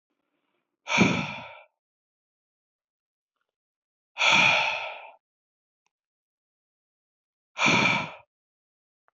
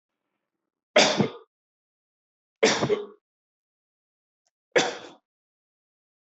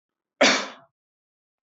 {"exhalation_length": "9.1 s", "exhalation_amplitude": 15440, "exhalation_signal_mean_std_ratio": 0.33, "three_cough_length": "6.2 s", "three_cough_amplitude": 19397, "three_cough_signal_mean_std_ratio": 0.28, "cough_length": "1.6 s", "cough_amplitude": 18551, "cough_signal_mean_std_ratio": 0.3, "survey_phase": "beta (2021-08-13 to 2022-03-07)", "age": "45-64", "gender": "Male", "wearing_mask": "No", "symptom_none": true, "smoker_status": "Never smoked", "respiratory_condition_asthma": false, "respiratory_condition_other": false, "recruitment_source": "REACT", "submission_delay": "1 day", "covid_test_result": "Negative", "covid_test_method": "RT-qPCR"}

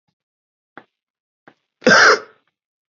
{"cough_length": "2.9 s", "cough_amplitude": 29290, "cough_signal_mean_std_ratio": 0.28, "survey_phase": "beta (2021-08-13 to 2022-03-07)", "age": "18-44", "gender": "Male", "wearing_mask": "No", "symptom_cough_any": true, "symptom_fever_high_temperature": true, "symptom_onset": "11 days", "smoker_status": "Current smoker (1 to 10 cigarettes per day)", "respiratory_condition_asthma": false, "respiratory_condition_other": false, "recruitment_source": "Test and Trace", "submission_delay": "2 days", "covid_test_result": "Positive", "covid_test_method": "RT-qPCR", "covid_ct_value": 23.5, "covid_ct_gene": "N gene"}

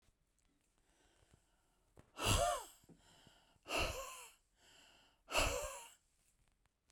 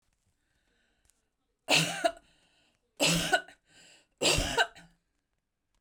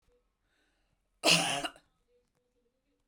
{"exhalation_length": "6.9 s", "exhalation_amplitude": 3206, "exhalation_signal_mean_std_ratio": 0.36, "three_cough_length": "5.8 s", "three_cough_amplitude": 9290, "three_cough_signal_mean_std_ratio": 0.36, "cough_length": "3.1 s", "cough_amplitude": 10974, "cough_signal_mean_std_ratio": 0.27, "survey_phase": "beta (2021-08-13 to 2022-03-07)", "age": "65+", "gender": "Female", "wearing_mask": "No", "symptom_none": true, "smoker_status": "Ex-smoker", "respiratory_condition_asthma": false, "respiratory_condition_other": false, "recruitment_source": "REACT", "submission_delay": "2 days", "covid_test_result": "Negative", "covid_test_method": "RT-qPCR"}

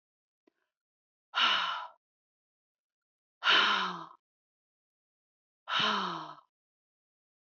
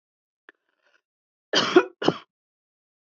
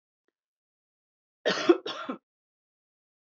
{"exhalation_length": "7.5 s", "exhalation_amplitude": 6804, "exhalation_signal_mean_std_ratio": 0.35, "cough_length": "3.1 s", "cough_amplitude": 24689, "cough_signal_mean_std_ratio": 0.24, "three_cough_length": "3.2 s", "three_cough_amplitude": 14752, "three_cough_signal_mean_std_ratio": 0.24, "survey_phase": "alpha (2021-03-01 to 2021-08-12)", "age": "65+", "gender": "Female", "wearing_mask": "No", "symptom_none": true, "smoker_status": "Never smoked", "respiratory_condition_asthma": false, "respiratory_condition_other": false, "recruitment_source": "REACT", "submission_delay": "2 days", "covid_test_result": "Negative", "covid_test_method": "RT-qPCR"}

